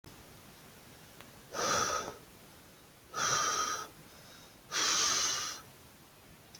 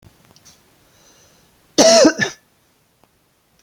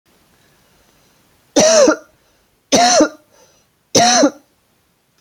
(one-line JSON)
{"exhalation_length": "6.6 s", "exhalation_amplitude": 3846, "exhalation_signal_mean_std_ratio": 0.57, "cough_length": "3.6 s", "cough_amplitude": 30007, "cough_signal_mean_std_ratio": 0.29, "three_cough_length": "5.2 s", "three_cough_amplitude": 32483, "three_cough_signal_mean_std_ratio": 0.41, "survey_phase": "beta (2021-08-13 to 2022-03-07)", "age": "18-44", "gender": "Male", "wearing_mask": "No", "symptom_none": true, "smoker_status": "Never smoked", "respiratory_condition_asthma": false, "respiratory_condition_other": false, "recruitment_source": "REACT", "submission_delay": "0 days", "covid_test_result": "Negative", "covid_test_method": "RT-qPCR", "influenza_a_test_result": "Negative", "influenza_b_test_result": "Negative"}